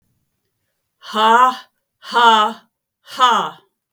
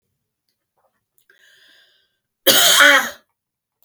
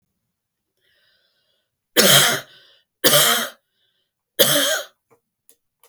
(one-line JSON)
{"exhalation_length": "3.9 s", "exhalation_amplitude": 32768, "exhalation_signal_mean_std_ratio": 0.45, "cough_length": "3.8 s", "cough_amplitude": 32768, "cough_signal_mean_std_ratio": 0.32, "three_cough_length": "5.9 s", "three_cough_amplitude": 32768, "three_cough_signal_mean_std_ratio": 0.37, "survey_phase": "beta (2021-08-13 to 2022-03-07)", "age": "65+", "gender": "Female", "wearing_mask": "No", "symptom_none": true, "smoker_status": "Never smoked", "respiratory_condition_asthma": false, "respiratory_condition_other": false, "recruitment_source": "Test and Trace", "submission_delay": "1 day", "covid_test_result": "Negative", "covid_test_method": "RT-qPCR"}